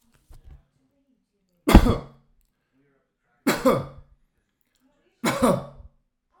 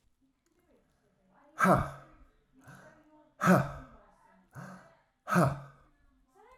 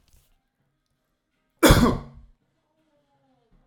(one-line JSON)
{"three_cough_length": "6.4 s", "three_cough_amplitude": 32768, "three_cough_signal_mean_std_ratio": 0.27, "exhalation_length": "6.6 s", "exhalation_amplitude": 8740, "exhalation_signal_mean_std_ratio": 0.3, "cough_length": "3.7 s", "cough_amplitude": 25999, "cough_signal_mean_std_ratio": 0.24, "survey_phase": "alpha (2021-03-01 to 2021-08-12)", "age": "45-64", "gender": "Male", "wearing_mask": "No", "symptom_none": true, "smoker_status": "Never smoked", "respiratory_condition_asthma": false, "respiratory_condition_other": false, "recruitment_source": "REACT", "submission_delay": "0 days", "covid_test_result": "Negative", "covid_test_method": "RT-qPCR"}